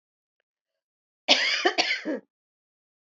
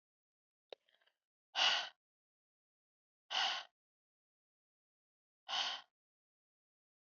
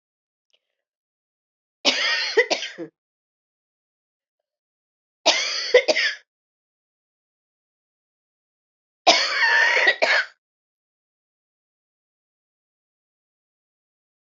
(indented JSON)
{
  "cough_length": "3.1 s",
  "cough_amplitude": 23120,
  "cough_signal_mean_std_ratio": 0.37,
  "exhalation_length": "7.1 s",
  "exhalation_amplitude": 3224,
  "exhalation_signal_mean_std_ratio": 0.27,
  "three_cough_length": "14.3 s",
  "three_cough_amplitude": 32768,
  "three_cough_signal_mean_std_ratio": 0.32,
  "survey_phase": "beta (2021-08-13 to 2022-03-07)",
  "age": "45-64",
  "gender": "Female",
  "wearing_mask": "No",
  "symptom_shortness_of_breath": true,
  "symptom_change_to_sense_of_smell_or_taste": true,
  "symptom_loss_of_taste": true,
  "symptom_onset": "6 days",
  "smoker_status": "Never smoked",
  "respiratory_condition_asthma": false,
  "respiratory_condition_other": false,
  "recruitment_source": "Test and Trace",
  "submission_delay": "1 day",
  "covid_test_result": "Positive",
  "covid_test_method": "RT-qPCR"
}